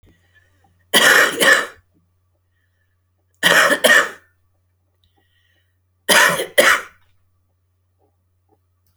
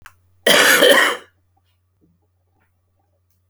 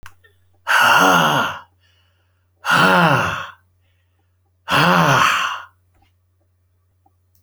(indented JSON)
{
  "three_cough_length": "9.0 s",
  "three_cough_amplitude": 32662,
  "three_cough_signal_mean_std_ratio": 0.36,
  "cough_length": "3.5 s",
  "cough_amplitude": 32661,
  "cough_signal_mean_std_ratio": 0.37,
  "exhalation_length": "7.4 s",
  "exhalation_amplitude": 32661,
  "exhalation_signal_mean_std_ratio": 0.49,
  "survey_phase": "beta (2021-08-13 to 2022-03-07)",
  "age": "65+",
  "gender": "Male",
  "wearing_mask": "No",
  "symptom_cough_any": true,
  "smoker_status": "Current smoker (1 to 10 cigarettes per day)",
  "respiratory_condition_asthma": false,
  "respiratory_condition_other": false,
  "recruitment_source": "REACT",
  "submission_delay": "1 day",
  "covid_test_result": "Negative",
  "covid_test_method": "RT-qPCR"
}